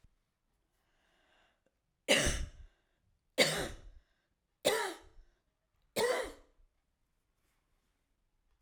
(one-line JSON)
{"cough_length": "8.6 s", "cough_amplitude": 7667, "cough_signal_mean_std_ratio": 0.31, "survey_phase": "alpha (2021-03-01 to 2021-08-12)", "age": "65+", "gender": "Female", "wearing_mask": "No", "symptom_none": true, "smoker_status": "Ex-smoker", "respiratory_condition_asthma": false, "respiratory_condition_other": false, "recruitment_source": "REACT", "submission_delay": "2 days", "covid_test_result": "Negative", "covid_test_method": "RT-qPCR"}